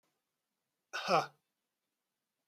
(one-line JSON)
{"cough_length": "2.5 s", "cough_amplitude": 5261, "cough_signal_mean_std_ratio": 0.24, "survey_phase": "beta (2021-08-13 to 2022-03-07)", "age": "45-64", "gender": "Male", "wearing_mask": "No", "symptom_none": true, "smoker_status": "Current smoker (11 or more cigarettes per day)", "respiratory_condition_asthma": false, "respiratory_condition_other": false, "recruitment_source": "REACT", "submission_delay": "1 day", "covid_test_result": "Negative", "covid_test_method": "RT-qPCR", "influenza_a_test_result": "Negative", "influenza_b_test_result": "Negative"}